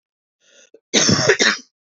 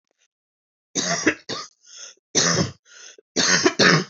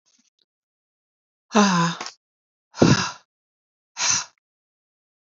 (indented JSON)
{
  "cough_length": "2.0 s",
  "cough_amplitude": 28960,
  "cough_signal_mean_std_ratio": 0.45,
  "three_cough_length": "4.1 s",
  "three_cough_amplitude": 28004,
  "three_cough_signal_mean_std_ratio": 0.47,
  "exhalation_length": "5.4 s",
  "exhalation_amplitude": 26585,
  "exhalation_signal_mean_std_ratio": 0.32,
  "survey_phase": "beta (2021-08-13 to 2022-03-07)",
  "age": "45-64",
  "gender": "Female",
  "wearing_mask": "No",
  "symptom_cough_any": true,
  "symptom_runny_or_blocked_nose": true,
  "symptom_sore_throat": true,
  "symptom_fatigue": true,
  "symptom_headache": true,
  "smoker_status": "Never smoked",
  "respiratory_condition_asthma": false,
  "respiratory_condition_other": false,
  "recruitment_source": "Test and Trace",
  "submission_delay": "2 days",
  "covid_test_result": "Positive",
  "covid_test_method": "RT-qPCR",
  "covid_ct_value": 27.0,
  "covid_ct_gene": "N gene"
}